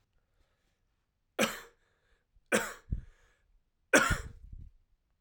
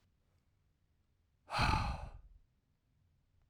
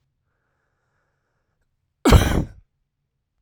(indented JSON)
{
  "three_cough_length": "5.2 s",
  "three_cough_amplitude": 12313,
  "three_cough_signal_mean_std_ratio": 0.28,
  "exhalation_length": "3.5 s",
  "exhalation_amplitude": 3801,
  "exhalation_signal_mean_std_ratio": 0.33,
  "cough_length": "3.4 s",
  "cough_amplitude": 32767,
  "cough_signal_mean_std_ratio": 0.25,
  "survey_phase": "alpha (2021-03-01 to 2021-08-12)",
  "age": "18-44",
  "gender": "Male",
  "wearing_mask": "No",
  "symptom_cough_any": true,
  "symptom_shortness_of_breath": true,
  "symptom_fatigue": true,
  "symptom_fever_high_temperature": true,
  "symptom_headache": true,
  "symptom_loss_of_taste": true,
  "symptom_onset": "4 days",
  "smoker_status": "Never smoked",
  "respiratory_condition_asthma": true,
  "respiratory_condition_other": false,
  "recruitment_source": "Test and Trace",
  "submission_delay": "1 day",
  "covid_test_result": "Positive",
  "covid_test_method": "RT-qPCR",
  "covid_ct_value": 18.1,
  "covid_ct_gene": "ORF1ab gene",
  "covid_ct_mean": 18.6,
  "covid_viral_load": "780000 copies/ml",
  "covid_viral_load_category": "Low viral load (10K-1M copies/ml)"
}